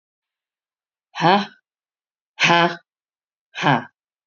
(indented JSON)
{
  "exhalation_length": "4.3 s",
  "exhalation_amplitude": 30121,
  "exhalation_signal_mean_std_ratio": 0.32,
  "survey_phase": "beta (2021-08-13 to 2022-03-07)",
  "age": "45-64",
  "gender": "Female",
  "wearing_mask": "No",
  "symptom_cough_any": true,
  "symptom_runny_or_blocked_nose": true,
  "symptom_fatigue": true,
  "symptom_headache": true,
  "symptom_onset": "7 days",
  "smoker_status": "Ex-smoker",
  "respiratory_condition_asthma": false,
  "respiratory_condition_other": false,
  "recruitment_source": "Test and Trace",
  "submission_delay": "1 day",
  "covid_test_result": "Positive",
  "covid_test_method": "RT-qPCR",
  "covid_ct_value": 26.6,
  "covid_ct_gene": "N gene",
  "covid_ct_mean": 26.8,
  "covid_viral_load": "1600 copies/ml",
  "covid_viral_load_category": "Minimal viral load (< 10K copies/ml)"
}